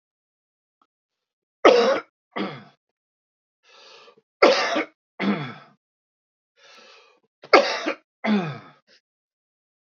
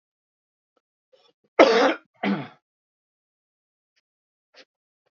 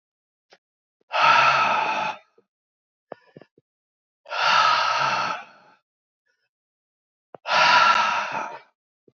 {
  "three_cough_length": "9.9 s",
  "three_cough_amplitude": 31073,
  "three_cough_signal_mean_std_ratio": 0.3,
  "cough_length": "5.1 s",
  "cough_amplitude": 28480,
  "cough_signal_mean_std_ratio": 0.23,
  "exhalation_length": "9.1 s",
  "exhalation_amplitude": 19991,
  "exhalation_signal_mean_std_ratio": 0.48,
  "survey_phase": "beta (2021-08-13 to 2022-03-07)",
  "age": "65+",
  "gender": "Male",
  "wearing_mask": "No",
  "symptom_cough_any": true,
  "symptom_onset": "13 days",
  "smoker_status": "Ex-smoker",
  "respiratory_condition_asthma": false,
  "respiratory_condition_other": false,
  "recruitment_source": "REACT",
  "submission_delay": "5 days",
  "covid_test_result": "Positive",
  "covid_test_method": "RT-qPCR",
  "covid_ct_value": 37.6,
  "covid_ct_gene": "E gene",
  "influenza_a_test_result": "Negative",
  "influenza_b_test_result": "Negative"
}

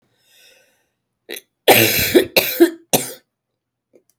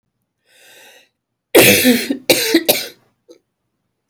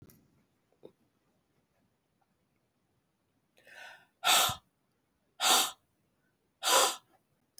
{
  "cough_length": "4.2 s",
  "cough_amplitude": 32768,
  "cough_signal_mean_std_ratio": 0.36,
  "three_cough_length": "4.1 s",
  "three_cough_amplitude": 32768,
  "three_cough_signal_mean_std_ratio": 0.39,
  "exhalation_length": "7.6 s",
  "exhalation_amplitude": 8127,
  "exhalation_signal_mean_std_ratio": 0.28,
  "survey_phase": "beta (2021-08-13 to 2022-03-07)",
  "age": "45-64",
  "gender": "Female",
  "wearing_mask": "No",
  "symptom_cough_any": true,
  "symptom_sore_throat": true,
  "symptom_diarrhoea": true,
  "smoker_status": "Never smoked",
  "respiratory_condition_asthma": false,
  "respiratory_condition_other": false,
  "recruitment_source": "Test and Trace",
  "submission_delay": "3 days",
  "covid_test_result": "Negative",
  "covid_test_method": "RT-qPCR"
}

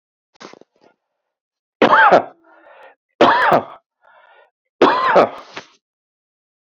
{
  "three_cough_length": "6.7 s",
  "three_cough_amplitude": 28525,
  "three_cough_signal_mean_std_ratio": 0.36,
  "survey_phase": "beta (2021-08-13 to 2022-03-07)",
  "age": "45-64",
  "gender": "Male",
  "wearing_mask": "No",
  "symptom_cough_any": true,
  "symptom_runny_or_blocked_nose": true,
  "symptom_sore_throat": true,
  "symptom_fatigue": true,
  "symptom_onset": "11 days",
  "smoker_status": "Ex-smoker",
  "respiratory_condition_asthma": false,
  "respiratory_condition_other": false,
  "recruitment_source": "REACT",
  "submission_delay": "1 day",
  "covid_test_result": "Negative",
  "covid_test_method": "RT-qPCR"
}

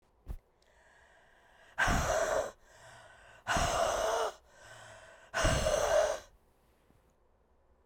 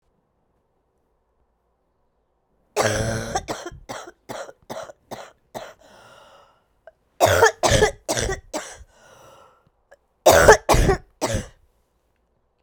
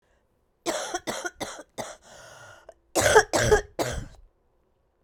{
  "exhalation_length": "7.9 s",
  "exhalation_amplitude": 5466,
  "exhalation_signal_mean_std_ratio": 0.52,
  "three_cough_length": "12.6 s",
  "three_cough_amplitude": 32768,
  "three_cough_signal_mean_std_ratio": 0.33,
  "cough_length": "5.0 s",
  "cough_amplitude": 24206,
  "cough_signal_mean_std_ratio": 0.38,
  "survey_phase": "beta (2021-08-13 to 2022-03-07)",
  "age": "45-64",
  "gender": "Female",
  "wearing_mask": "No",
  "symptom_cough_any": true,
  "symptom_new_continuous_cough": true,
  "symptom_runny_or_blocked_nose": true,
  "symptom_sore_throat": true,
  "symptom_abdominal_pain": true,
  "symptom_diarrhoea": true,
  "symptom_headache": true,
  "symptom_loss_of_taste": true,
  "symptom_onset": "3 days",
  "smoker_status": "Never smoked",
  "respiratory_condition_asthma": false,
  "respiratory_condition_other": false,
  "recruitment_source": "Test and Trace",
  "submission_delay": "1 day",
  "covid_test_result": "Positive",
  "covid_test_method": "RT-qPCR",
  "covid_ct_value": 16.4,
  "covid_ct_gene": "ORF1ab gene",
  "covid_ct_mean": 16.6,
  "covid_viral_load": "3500000 copies/ml",
  "covid_viral_load_category": "High viral load (>1M copies/ml)"
}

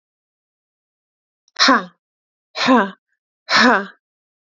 {
  "exhalation_length": "4.5 s",
  "exhalation_amplitude": 28284,
  "exhalation_signal_mean_std_ratio": 0.34,
  "survey_phase": "beta (2021-08-13 to 2022-03-07)",
  "age": "18-44",
  "gender": "Female",
  "wearing_mask": "No",
  "symptom_none": true,
  "symptom_onset": "10 days",
  "smoker_status": "Ex-smoker",
  "respiratory_condition_asthma": true,
  "respiratory_condition_other": false,
  "recruitment_source": "REACT",
  "submission_delay": "2 days",
  "covid_test_result": "Negative",
  "covid_test_method": "RT-qPCR",
  "influenza_a_test_result": "Unknown/Void",
  "influenza_b_test_result": "Unknown/Void"
}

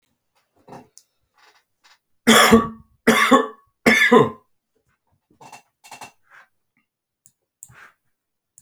{
  "three_cough_length": "8.6 s",
  "three_cough_amplitude": 32767,
  "three_cough_signal_mean_std_ratio": 0.3,
  "survey_phase": "beta (2021-08-13 to 2022-03-07)",
  "age": "65+",
  "gender": "Male",
  "wearing_mask": "No",
  "symptom_cough_any": true,
  "smoker_status": "Never smoked",
  "respiratory_condition_asthma": false,
  "respiratory_condition_other": false,
  "recruitment_source": "REACT",
  "submission_delay": "3 days",
  "covid_test_result": "Negative",
  "covid_test_method": "RT-qPCR"
}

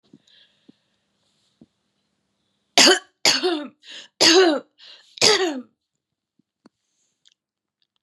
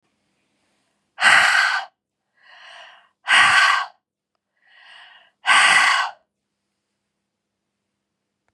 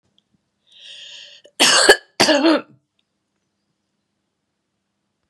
{
  "three_cough_length": "8.0 s",
  "three_cough_amplitude": 32762,
  "three_cough_signal_mean_std_ratio": 0.31,
  "exhalation_length": "8.5 s",
  "exhalation_amplitude": 29325,
  "exhalation_signal_mean_std_ratio": 0.38,
  "cough_length": "5.3 s",
  "cough_amplitude": 32768,
  "cough_signal_mean_std_ratio": 0.31,
  "survey_phase": "beta (2021-08-13 to 2022-03-07)",
  "age": "45-64",
  "gender": "Female",
  "wearing_mask": "No",
  "symptom_cough_any": true,
  "symptom_sore_throat": true,
  "symptom_onset": "3 days",
  "smoker_status": "Ex-smoker",
  "respiratory_condition_asthma": false,
  "respiratory_condition_other": false,
  "recruitment_source": "Test and Trace",
  "submission_delay": "1 day",
  "covid_test_result": "Positive",
  "covid_test_method": "RT-qPCR",
  "covid_ct_value": 22.9,
  "covid_ct_gene": "ORF1ab gene"
}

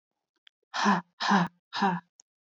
{
  "exhalation_length": "2.6 s",
  "exhalation_amplitude": 10394,
  "exhalation_signal_mean_std_ratio": 0.44,
  "survey_phase": "beta (2021-08-13 to 2022-03-07)",
  "age": "18-44",
  "gender": "Female",
  "wearing_mask": "No",
  "symptom_fatigue": true,
  "symptom_headache": true,
  "smoker_status": "Never smoked",
  "respiratory_condition_asthma": false,
  "respiratory_condition_other": false,
  "recruitment_source": "Test and Trace",
  "submission_delay": "2 days",
  "covid_test_result": "Negative",
  "covid_test_method": "RT-qPCR"
}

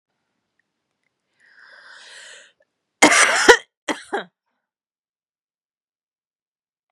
{
  "cough_length": "6.9 s",
  "cough_amplitude": 32768,
  "cough_signal_mean_std_ratio": 0.23,
  "survey_phase": "beta (2021-08-13 to 2022-03-07)",
  "age": "45-64",
  "gender": "Female",
  "wearing_mask": "No",
  "symptom_cough_any": true,
  "symptom_new_continuous_cough": true,
  "symptom_runny_or_blocked_nose": true,
  "symptom_shortness_of_breath": true,
  "symptom_sore_throat": true,
  "symptom_fatigue": true,
  "symptom_headache": true,
  "symptom_change_to_sense_of_smell_or_taste": true,
  "symptom_onset": "3 days",
  "smoker_status": "Never smoked",
  "respiratory_condition_asthma": false,
  "respiratory_condition_other": false,
  "recruitment_source": "Test and Trace",
  "submission_delay": "1 day",
  "covid_test_result": "Positive",
  "covid_test_method": "RT-qPCR",
  "covid_ct_value": 27.0,
  "covid_ct_gene": "N gene"
}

